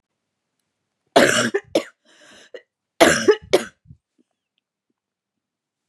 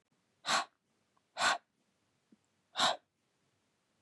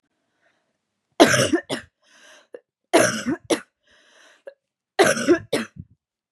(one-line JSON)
{"cough_length": "5.9 s", "cough_amplitude": 32767, "cough_signal_mean_std_ratio": 0.28, "exhalation_length": "4.0 s", "exhalation_amplitude": 4468, "exhalation_signal_mean_std_ratio": 0.3, "three_cough_length": "6.3 s", "three_cough_amplitude": 32767, "three_cough_signal_mean_std_ratio": 0.35, "survey_phase": "beta (2021-08-13 to 2022-03-07)", "age": "18-44", "gender": "Female", "wearing_mask": "No", "symptom_cough_any": true, "symptom_sore_throat": true, "symptom_change_to_sense_of_smell_or_taste": true, "symptom_onset": "4 days", "smoker_status": "Never smoked", "respiratory_condition_asthma": false, "respiratory_condition_other": false, "recruitment_source": "Test and Trace", "submission_delay": "1 day", "covid_test_result": "Negative", "covid_test_method": "RT-qPCR"}